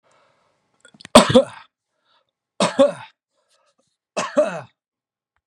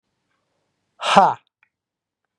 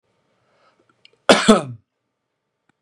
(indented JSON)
{
  "three_cough_length": "5.5 s",
  "three_cough_amplitude": 32768,
  "three_cough_signal_mean_std_ratio": 0.27,
  "exhalation_length": "2.4 s",
  "exhalation_amplitude": 32768,
  "exhalation_signal_mean_std_ratio": 0.25,
  "cough_length": "2.8 s",
  "cough_amplitude": 32768,
  "cough_signal_mean_std_ratio": 0.24,
  "survey_phase": "beta (2021-08-13 to 2022-03-07)",
  "age": "45-64",
  "gender": "Male",
  "wearing_mask": "No",
  "symptom_runny_or_blocked_nose": true,
  "symptom_change_to_sense_of_smell_or_taste": true,
  "smoker_status": "Never smoked",
  "respiratory_condition_asthma": false,
  "respiratory_condition_other": false,
  "recruitment_source": "REACT",
  "submission_delay": "4 days",
  "covid_test_result": "Negative",
  "covid_test_method": "RT-qPCR",
  "influenza_a_test_result": "Negative",
  "influenza_b_test_result": "Negative"
}